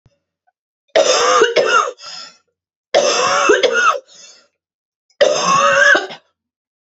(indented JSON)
{
  "three_cough_length": "6.8 s",
  "three_cough_amplitude": 32767,
  "three_cough_signal_mean_std_ratio": 0.57,
  "survey_phase": "beta (2021-08-13 to 2022-03-07)",
  "age": "45-64",
  "gender": "Female",
  "wearing_mask": "No",
  "symptom_cough_any": true,
  "symptom_runny_or_blocked_nose": true,
  "symptom_sore_throat": true,
  "symptom_fatigue": true,
  "symptom_headache": true,
  "smoker_status": "Never smoked",
  "respiratory_condition_asthma": true,
  "respiratory_condition_other": false,
  "recruitment_source": "Test and Trace",
  "submission_delay": "1 day",
  "covid_test_result": "Positive",
  "covid_test_method": "LFT"
}